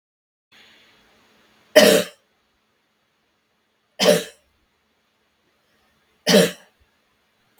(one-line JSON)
{"three_cough_length": "7.6 s", "three_cough_amplitude": 32768, "three_cough_signal_mean_std_ratio": 0.24, "survey_phase": "beta (2021-08-13 to 2022-03-07)", "age": "18-44", "gender": "Female", "wearing_mask": "No", "symptom_runny_or_blocked_nose": true, "symptom_fatigue": true, "symptom_headache": true, "smoker_status": "Never smoked", "respiratory_condition_asthma": false, "respiratory_condition_other": false, "recruitment_source": "Test and Trace", "submission_delay": "1 day", "covid_test_result": "Negative", "covid_test_method": "RT-qPCR"}